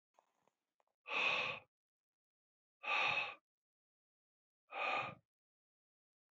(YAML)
exhalation_length: 6.3 s
exhalation_amplitude: 1948
exhalation_signal_mean_std_ratio: 0.38
survey_phase: beta (2021-08-13 to 2022-03-07)
age: 45-64
gender: Male
wearing_mask: 'No'
symptom_cough_any: true
symptom_runny_or_blocked_nose: true
symptom_shortness_of_breath: true
symptom_sore_throat: true
symptom_fever_high_temperature: true
symptom_headache: true
symptom_onset: 3 days
smoker_status: Ex-smoker
respiratory_condition_asthma: false
respiratory_condition_other: false
recruitment_source: Test and Trace
submission_delay: 2 days
covid_test_result: Positive
covid_test_method: RT-qPCR
covid_ct_value: 15.2
covid_ct_gene: ORF1ab gene
covid_ct_mean: 15.5
covid_viral_load: 8100000 copies/ml
covid_viral_load_category: High viral load (>1M copies/ml)